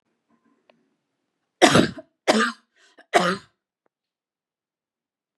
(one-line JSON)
{"three_cough_length": "5.4 s", "three_cough_amplitude": 32720, "three_cough_signal_mean_std_ratio": 0.27, "survey_phase": "beta (2021-08-13 to 2022-03-07)", "age": "45-64", "gender": "Female", "wearing_mask": "No", "symptom_none": true, "smoker_status": "Never smoked", "respiratory_condition_asthma": false, "respiratory_condition_other": false, "recruitment_source": "REACT", "submission_delay": "1 day", "covid_test_result": "Negative", "covid_test_method": "RT-qPCR"}